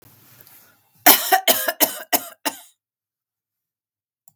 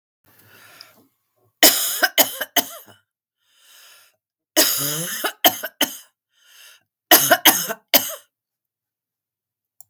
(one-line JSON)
{"cough_length": "4.4 s", "cough_amplitude": 32768, "cough_signal_mean_std_ratio": 0.3, "three_cough_length": "9.9 s", "three_cough_amplitude": 32768, "three_cough_signal_mean_std_ratio": 0.33, "survey_phase": "beta (2021-08-13 to 2022-03-07)", "age": "65+", "gender": "Female", "wearing_mask": "No", "symptom_runny_or_blocked_nose": true, "smoker_status": "Ex-smoker", "respiratory_condition_asthma": false, "respiratory_condition_other": false, "recruitment_source": "REACT", "submission_delay": "1 day", "covid_test_result": "Negative", "covid_test_method": "RT-qPCR", "influenza_a_test_result": "Negative", "influenza_b_test_result": "Negative"}